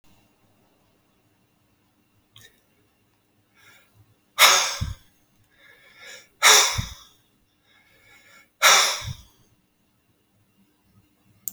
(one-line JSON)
{"exhalation_length": "11.5 s", "exhalation_amplitude": 29320, "exhalation_signal_mean_std_ratio": 0.25, "survey_phase": "alpha (2021-03-01 to 2021-08-12)", "age": "65+", "gender": "Male", "wearing_mask": "No", "symptom_none": true, "smoker_status": "Ex-smoker", "respiratory_condition_asthma": false, "respiratory_condition_other": false, "recruitment_source": "REACT", "submission_delay": "8 days", "covid_test_result": "Negative", "covid_test_method": "RT-qPCR"}